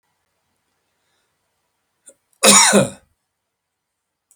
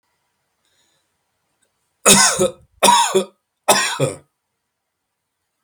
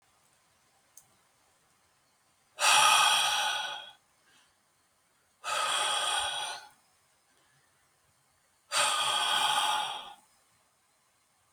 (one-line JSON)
{"cough_length": "4.4 s", "cough_amplitude": 32768, "cough_signal_mean_std_ratio": 0.26, "three_cough_length": "5.6 s", "three_cough_amplitude": 32768, "three_cough_signal_mean_std_ratio": 0.36, "exhalation_length": "11.5 s", "exhalation_amplitude": 10369, "exhalation_signal_mean_std_ratio": 0.45, "survey_phase": "alpha (2021-03-01 to 2021-08-12)", "age": "65+", "gender": "Male", "wearing_mask": "No", "symptom_none": true, "smoker_status": "Never smoked", "respiratory_condition_asthma": false, "respiratory_condition_other": false, "recruitment_source": "REACT", "submission_delay": "4 days", "covid_test_result": "Negative", "covid_test_method": "RT-qPCR"}